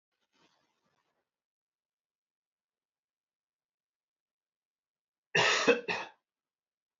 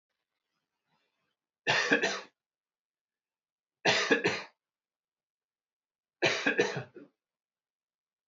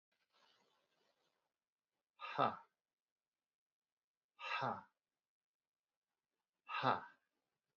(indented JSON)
{
  "cough_length": "7.0 s",
  "cough_amplitude": 8497,
  "cough_signal_mean_std_ratio": 0.21,
  "three_cough_length": "8.3 s",
  "three_cough_amplitude": 8734,
  "three_cough_signal_mean_std_ratio": 0.33,
  "exhalation_length": "7.8 s",
  "exhalation_amplitude": 2694,
  "exhalation_signal_mean_std_ratio": 0.25,
  "survey_phase": "beta (2021-08-13 to 2022-03-07)",
  "age": "45-64",
  "gender": "Male",
  "wearing_mask": "No",
  "symptom_none": true,
  "smoker_status": "Ex-smoker",
  "respiratory_condition_asthma": false,
  "respiratory_condition_other": false,
  "recruitment_source": "REACT",
  "submission_delay": "0 days",
  "covid_test_result": "Negative",
  "covid_test_method": "RT-qPCR",
  "influenza_a_test_result": "Negative",
  "influenza_b_test_result": "Negative"
}